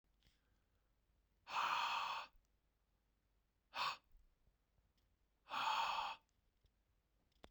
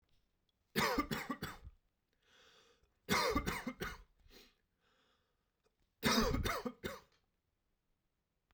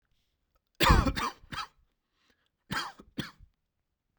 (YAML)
exhalation_length: 7.5 s
exhalation_amplitude: 1357
exhalation_signal_mean_std_ratio: 0.4
three_cough_length: 8.5 s
three_cough_amplitude: 3766
three_cough_signal_mean_std_ratio: 0.4
cough_length: 4.2 s
cough_amplitude: 12563
cough_signal_mean_std_ratio: 0.3
survey_phase: beta (2021-08-13 to 2022-03-07)
age: 18-44
gender: Male
wearing_mask: 'No'
symptom_sore_throat: true
symptom_fatigue: true
symptom_fever_high_temperature: true
symptom_headache: true
symptom_onset: 5 days
smoker_status: Current smoker (e-cigarettes or vapes only)
respiratory_condition_asthma: false
respiratory_condition_other: false
recruitment_source: Test and Trace
submission_delay: 2 days
covid_test_result: Positive
covid_test_method: RT-qPCR
covid_ct_value: 25.0
covid_ct_gene: ORF1ab gene
covid_ct_mean: 25.6
covid_viral_load: 4000 copies/ml
covid_viral_load_category: Minimal viral load (< 10K copies/ml)